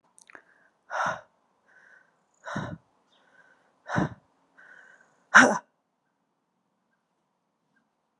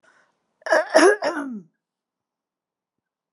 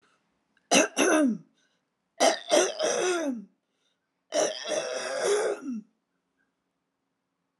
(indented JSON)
{
  "exhalation_length": "8.2 s",
  "exhalation_amplitude": 27036,
  "exhalation_signal_mean_std_ratio": 0.2,
  "cough_length": "3.3 s",
  "cough_amplitude": 28699,
  "cough_signal_mean_std_ratio": 0.33,
  "three_cough_length": "7.6 s",
  "three_cough_amplitude": 17738,
  "three_cough_signal_mean_std_ratio": 0.5,
  "survey_phase": "alpha (2021-03-01 to 2021-08-12)",
  "age": "45-64",
  "gender": "Female",
  "wearing_mask": "No",
  "symptom_none": true,
  "smoker_status": "Ex-smoker",
  "respiratory_condition_asthma": false,
  "respiratory_condition_other": false,
  "recruitment_source": "REACT",
  "submission_delay": "2 days",
  "covid_test_result": "Negative",
  "covid_test_method": "RT-qPCR"
}